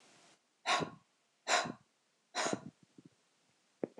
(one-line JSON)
{"exhalation_length": "4.0 s", "exhalation_amplitude": 4387, "exhalation_signal_mean_std_ratio": 0.34, "survey_phase": "alpha (2021-03-01 to 2021-08-12)", "age": "18-44", "gender": "Female", "wearing_mask": "No", "symptom_none": true, "smoker_status": "Never smoked", "respiratory_condition_asthma": false, "respiratory_condition_other": false, "recruitment_source": "REACT", "submission_delay": "1 day", "covid_test_result": "Negative", "covid_test_method": "RT-qPCR"}